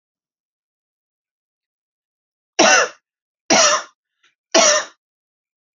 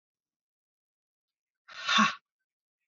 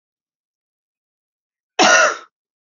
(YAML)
three_cough_length: 5.8 s
three_cough_amplitude: 32768
three_cough_signal_mean_std_ratio: 0.31
exhalation_length: 2.9 s
exhalation_amplitude: 9048
exhalation_signal_mean_std_ratio: 0.25
cough_length: 2.6 s
cough_amplitude: 30991
cough_signal_mean_std_ratio: 0.3
survey_phase: beta (2021-08-13 to 2022-03-07)
age: 18-44
gender: Female
wearing_mask: 'No'
symptom_cough_any: true
smoker_status: Never smoked
respiratory_condition_asthma: false
respiratory_condition_other: false
recruitment_source: Test and Trace
submission_delay: 2 days
covid_test_result: Positive
covid_test_method: RT-qPCR
covid_ct_value: 22.9
covid_ct_gene: ORF1ab gene
covid_ct_mean: 23.4
covid_viral_load: 22000 copies/ml
covid_viral_load_category: Low viral load (10K-1M copies/ml)